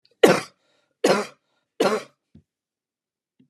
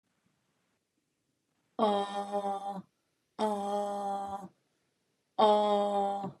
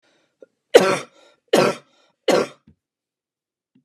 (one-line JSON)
{"cough_length": "3.5 s", "cough_amplitude": 32560, "cough_signal_mean_std_ratio": 0.29, "exhalation_length": "6.4 s", "exhalation_amplitude": 8246, "exhalation_signal_mean_std_ratio": 0.53, "three_cough_length": "3.8 s", "three_cough_amplitude": 32768, "three_cough_signal_mean_std_ratio": 0.29, "survey_phase": "beta (2021-08-13 to 2022-03-07)", "age": "45-64", "gender": "Female", "wearing_mask": "No", "symptom_cough_any": true, "symptom_runny_or_blocked_nose": true, "symptom_onset": "5 days", "smoker_status": "Never smoked", "respiratory_condition_asthma": false, "respiratory_condition_other": false, "recruitment_source": "REACT", "submission_delay": "2 days", "covid_test_result": "Negative", "covid_test_method": "RT-qPCR", "influenza_a_test_result": "Negative", "influenza_b_test_result": "Negative"}